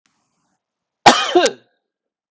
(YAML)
cough_length: 2.3 s
cough_amplitude: 32768
cough_signal_mean_std_ratio: 0.3
survey_phase: alpha (2021-03-01 to 2021-08-12)
age: 45-64
gender: Male
wearing_mask: 'No'
symptom_shortness_of_breath: true
symptom_fatigue: true
symptom_fever_high_temperature: true
symptom_headache: true
symptom_change_to_sense_of_smell_or_taste: true
symptom_onset: 3 days
smoker_status: Never smoked
respiratory_condition_asthma: true
respiratory_condition_other: false
recruitment_source: Test and Trace
submission_delay: 2 days
covid_test_result: Positive
covid_test_method: RT-qPCR
covid_ct_value: 12.9
covid_ct_gene: ORF1ab gene
covid_ct_mean: 13.6
covid_viral_load: 36000000 copies/ml
covid_viral_load_category: High viral load (>1M copies/ml)